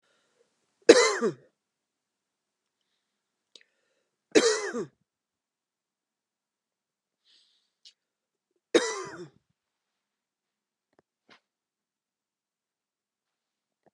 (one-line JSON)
{"three_cough_length": "13.9 s", "three_cough_amplitude": 29525, "three_cough_signal_mean_std_ratio": 0.18, "survey_phase": "beta (2021-08-13 to 2022-03-07)", "age": "45-64", "gender": "Female", "wearing_mask": "No", "symptom_runny_or_blocked_nose": true, "symptom_fatigue": true, "symptom_change_to_sense_of_smell_or_taste": true, "symptom_onset": "6 days", "smoker_status": "Never smoked", "respiratory_condition_asthma": false, "respiratory_condition_other": false, "recruitment_source": "REACT", "submission_delay": "1 day", "covid_test_result": "Positive", "covid_test_method": "RT-qPCR", "covid_ct_value": 35.0, "covid_ct_gene": "N gene", "influenza_a_test_result": "Negative", "influenza_b_test_result": "Negative"}